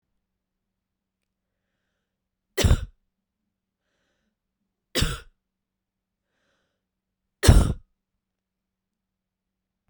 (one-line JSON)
{"three_cough_length": "9.9 s", "three_cough_amplitude": 32767, "three_cough_signal_mean_std_ratio": 0.18, "survey_phase": "beta (2021-08-13 to 2022-03-07)", "age": "45-64", "gender": "Female", "wearing_mask": "No", "symptom_fatigue": true, "smoker_status": "Never smoked", "respiratory_condition_asthma": false, "respiratory_condition_other": false, "recruitment_source": "REACT", "submission_delay": "2 days", "covid_test_result": "Negative", "covid_test_method": "RT-qPCR"}